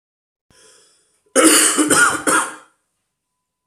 cough_length: 3.7 s
cough_amplitude: 32768
cough_signal_mean_std_ratio: 0.44
survey_phase: beta (2021-08-13 to 2022-03-07)
age: 18-44
gender: Male
wearing_mask: 'No'
symptom_cough_any: true
symptom_runny_or_blocked_nose: true
symptom_fatigue: true
symptom_headache: true
symptom_other: true
symptom_onset: 4 days
smoker_status: Never smoked
respiratory_condition_asthma: false
respiratory_condition_other: false
recruitment_source: Test and Trace
submission_delay: 2 days
covid_test_result: Positive
covid_test_method: RT-qPCR
covid_ct_value: 16.4
covid_ct_gene: ORF1ab gene
covid_ct_mean: 17.0
covid_viral_load: 2700000 copies/ml
covid_viral_load_category: High viral load (>1M copies/ml)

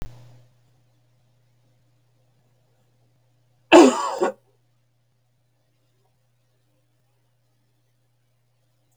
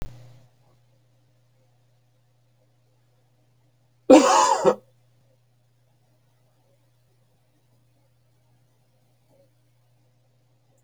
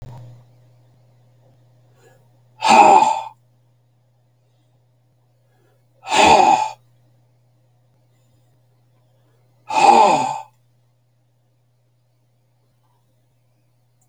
three_cough_length: 9.0 s
three_cough_amplitude: 29955
three_cough_signal_mean_std_ratio: 0.17
cough_length: 10.8 s
cough_amplitude: 27631
cough_signal_mean_std_ratio: 0.19
exhalation_length: 14.1 s
exhalation_amplitude: 29458
exhalation_signal_mean_std_ratio: 0.29
survey_phase: beta (2021-08-13 to 2022-03-07)
age: 65+
gender: Male
wearing_mask: 'No'
symptom_none: true
smoker_status: Never smoked
respiratory_condition_asthma: false
respiratory_condition_other: false
recruitment_source: REACT
submission_delay: 2 days
covid_test_result: Negative
covid_test_method: RT-qPCR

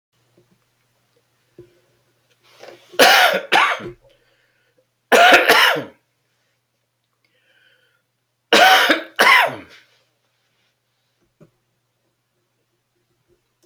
three_cough_length: 13.7 s
three_cough_amplitude: 32429
three_cough_signal_mean_std_ratio: 0.32
survey_phase: beta (2021-08-13 to 2022-03-07)
age: 65+
gender: Male
wearing_mask: 'No'
symptom_cough_any: true
symptom_fatigue: true
symptom_onset: 7 days
smoker_status: Never smoked
respiratory_condition_asthma: false
respiratory_condition_other: false
recruitment_source: Test and Trace
submission_delay: 2 days
covid_test_result: Positive
covid_test_method: RT-qPCR
covid_ct_value: 15.7
covid_ct_gene: ORF1ab gene
covid_ct_mean: 16.3
covid_viral_load: 4600000 copies/ml
covid_viral_load_category: High viral load (>1M copies/ml)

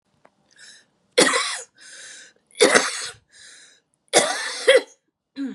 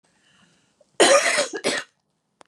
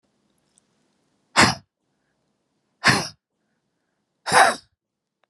three_cough_length: 5.5 s
three_cough_amplitude: 32005
three_cough_signal_mean_std_ratio: 0.38
cough_length: 2.5 s
cough_amplitude: 27643
cough_signal_mean_std_ratio: 0.4
exhalation_length: 5.3 s
exhalation_amplitude: 29750
exhalation_signal_mean_std_ratio: 0.26
survey_phase: beta (2021-08-13 to 2022-03-07)
age: 45-64
gender: Female
wearing_mask: 'No'
symptom_cough_any: true
symptom_runny_or_blocked_nose: true
symptom_other: true
symptom_onset: 5 days
smoker_status: Never smoked
respiratory_condition_asthma: true
respiratory_condition_other: false
recruitment_source: Test and Trace
submission_delay: 2 days
covid_test_result: Positive
covid_test_method: RT-qPCR
covid_ct_value: 27.6
covid_ct_gene: ORF1ab gene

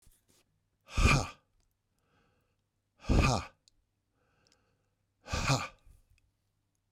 exhalation_length: 6.9 s
exhalation_amplitude: 7820
exhalation_signal_mean_std_ratio: 0.3
survey_phase: beta (2021-08-13 to 2022-03-07)
age: 65+
gender: Male
wearing_mask: 'No'
symptom_none: true
smoker_status: Ex-smoker
respiratory_condition_asthma: false
respiratory_condition_other: false
recruitment_source: REACT
submission_delay: 2 days
covid_test_result: Negative
covid_test_method: RT-qPCR
influenza_a_test_result: Unknown/Void
influenza_b_test_result: Unknown/Void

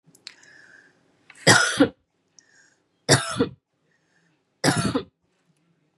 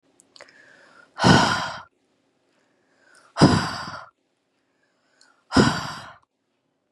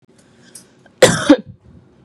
three_cough_length: 6.0 s
three_cough_amplitude: 28504
three_cough_signal_mean_std_ratio: 0.31
exhalation_length: 6.9 s
exhalation_amplitude: 29606
exhalation_signal_mean_std_ratio: 0.32
cough_length: 2.0 s
cough_amplitude: 32768
cough_signal_mean_std_ratio: 0.29
survey_phase: beta (2021-08-13 to 2022-03-07)
age: 18-44
gender: Female
wearing_mask: 'Yes'
symptom_sore_throat: true
symptom_fatigue: true
symptom_headache: true
symptom_other: true
symptom_onset: 2 days
smoker_status: Never smoked
respiratory_condition_asthma: false
respiratory_condition_other: true
recruitment_source: Test and Trace
submission_delay: 2 days
covid_test_result: Positive
covid_test_method: RT-qPCR
covid_ct_value: 21.1
covid_ct_gene: ORF1ab gene
covid_ct_mean: 21.4
covid_viral_load: 98000 copies/ml
covid_viral_load_category: Low viral load (10K-1M copies/ml)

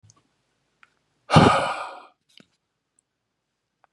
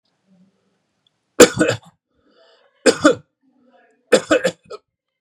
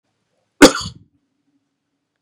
exhalation_length: 3.9 s
exhalation_amplitude: 29953
exhalation_signal_mean_std_ratio: 0.25
three_cough_length: 5.2 s
three_cough_amplitude: 32768
three_cough_signal_mean_std_ratio: 0.27
cough_length: 2.2 s
cough_amplitude: 32768
cough_signal_mean_std_ratio: 0.19
survey_phase: beta (2021-08-13 to 2022-03-07)
age: 45-64
gender: Male
wearing_mask: 'No'
symptom_none: true
smoker_status: Ex-smoker
respiratory_condition_asthma: false
respiratory_condition_other: false
recruitment_source: REACT
submission_delay: 1 day
covid_test_result: Negative
covid_test_method: RT-qPCR
influenza_a_test_result: Negative
influenza_b_test_result: Negative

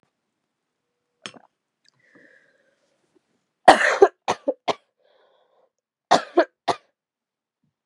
cough_length: 7.9 s
cough_amplitude: 32768
cough_signal_mean_std_ratio: 0.21
survey_phase: beta (2021-08-13 to 2022-03-07)
age: 18-44
gender: Female
wearing_mask: 'No'
symptom_cough_any: true
symptom_new_continuous_cough: true
symptom_runny_or_blocked_nose: true
symptom_shortness_of_breath: true
symptom_abdominal_pain: true
symptom_fatigue: true
symptom_headache: true
smoker_status: Never smoked
respiratory_condition_asthma: false
respiratory_condition_other: false
recruitment_source: Test and Trace
submission_delay: 1 day
covid_test_result: Positive
covid_test_method: RT-qPCR
covid_ct_value: 21.7
covid_ct_gene: ORF1ab gene
covid_ct_mean: 23.3
covid_viral_load: 24000 copies/ml
covid_viral_load_category: Low viral load (10K-1M copies/ml)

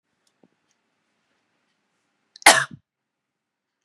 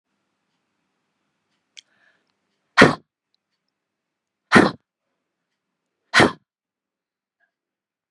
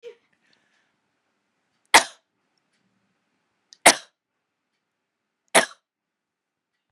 cough_length: 3.8 s
cough_amplitude: 32768
cough_signal_mean_std_ratio: 0.15
exhalation_length: 8.1 s
exhalation_amplitude: 32768
exhalation_signal_mean_std_ratio: 0.18
three_cough_length: 6.9 s
three_cough_amplitude: 32768
three_cough_signal_mean_std_ratio: 0.14
survey_phase: beta (2021-08-13 to 2022-03-07)
age: 45-64
gender: Female
wearing_mask: 'No'
symptom_none: true
smoker_status: Never smoked
respiratory_condition_asthma: true
respiratory_condition_other: false
recruitment_source: REACT
submission_delay: 0 days
covid_test_result: Negative
covid_test_method: RT-qPCR
influenza_a_test_result: Negative
influenza_b_test_result: Negative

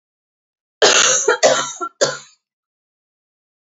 cough_length: 3.7 s
cough_amplitude: 30382
cough_signal_mean_std_ratio: 0.41
survey_phase: beta (2021-08-13 to 2022-03-07)
age: 45-64
gender: Female
wearing_mask: 'No'
symptom_runny_or_blocked_nose: true
symptom_onset: 12 days
smoker_status: Never smoked
respiratory_condition_asthma: false
respiratory_condition_other: false
recruitment_source: REACT
submission_delay: 3 days
covid_test_result: Negative
covid_test_method: RT-qPCR
influenza_a_test_result: Negative
influenza_b_test_result: Negative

